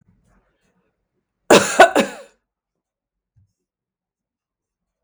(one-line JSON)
{"cough_length": "5.0 s", "cough_amplitude": 32768, "cough_signal_mean_std_ratio": 0.21, "survey_phase": "beta (2021-08-13 to 2022-03-07)", "age": "65+", "gender": "Female", "wearing_mask": "No", "symptom_none": true, "smoker_status": "Never smoked", "respiratory_condition_asthma": false, "respiratory_condition_other": false, "recruitment_source": "REACT", "submission_delay": "1 day", "covid_test_result": "Negative", "covid_test_method": "RT-qPCR"}